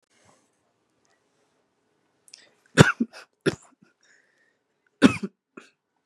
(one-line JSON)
{"three_cough_length": "6.1 s", "three_cough_amplitude": 32768, "three_cough_signal_mean_std_ratio": 0.17, "survey_phase": "beta (2021-08-13 to 2022-03-07)", "age": "18-44", "gender": "Female", "wearing_mask": "No", "symptom_cough_any": true, "symptom_runny_or_blocked_nose": true, "symptom_sore_throat": true, "symptom_onset": "12 days", "smoker_status": "Never smoked", "respiratory_condition_asthma": false, "respiratory_condition_other": false, "recruitment_source": "REACT", "submission_delay": "2 days", "covid_test_result": "Negative", "covid_test_method": "RT-qPCR", "influenza_a_test_result": "Negative", "influenza_b_test_result": "Negative"}